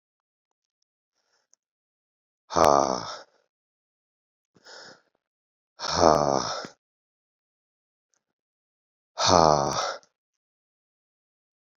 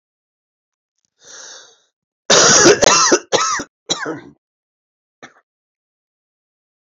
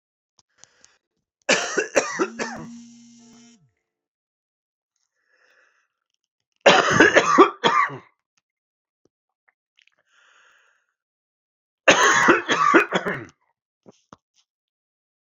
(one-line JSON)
{"exhalation_length": "11.8 s", "exhalation_amplitude": 27339, "exhalation_signal_mean_std_ratio": 0.25, "cough_length": "7.0 s", "cough_amplitude": 32767, "cough_signal_mean_std_ratio": 0.34, "three_cough_length": "15.4 s", "three_cough_amplitude": 32765, "three_cough_signal_mean_std_ratio": 0.32, "survey_phase": "beta (2021-08-13 to 2022-03-07)", "age": "45-64", "gender": "Male", "wearing_mask": "No", "symptom_cough_any": true, "symptom_runny_or_blocked_nose": true, "symptom_fatigue": true, "symptom_change_to_sense_of_smell_or_taste": true, "symptom_onset": "8 days", "smoker_status": "Current smoker (1 to 10 cigarettes per day)", "respiratory_condition_asthma": false, "respiratory_condition_other": false, "recruitment_source": "Test and Trace", "submission_delay": "2 days", "covid_test_result": "Positive", "covid_test_method": "RT-qPCR"}